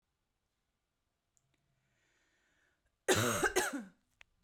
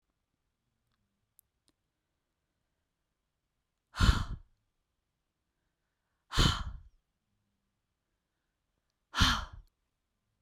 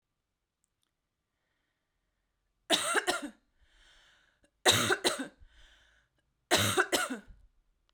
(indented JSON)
{
  "cough_length": "4.4 s",
  "cough_amplitude": 5095,
  "cough_signal_mean_std_ratio": 0.3,
  "exhalation_length": "10.4 s",
  "exhalation_amplitude": 9875,
  "exhalation_signal_mean_std_ratio": 0.22,
  "three_cough_length": "7.9 s",
  "three_cough_amplitude": 12597,
  "three_cough_signal_mean_std_ratio": 0.34,
  "survey_phase": "beta (2021-08-13 to 2022-03-07)",
  "age": "18-44",
  "gender": "Female",
  "wearing_mask": "No",
  "symptom_none": true,
  "smoker_status": "Never smoked",
  "respiratory_condition_asthma": true,
  "respiratory_condition_other": false,
  "recruitment_source": "REACT",
  "submission_delay": "3 days",
  "covid_test_result": "Negative",
  "covid_test_method": "RT-qPCR"
}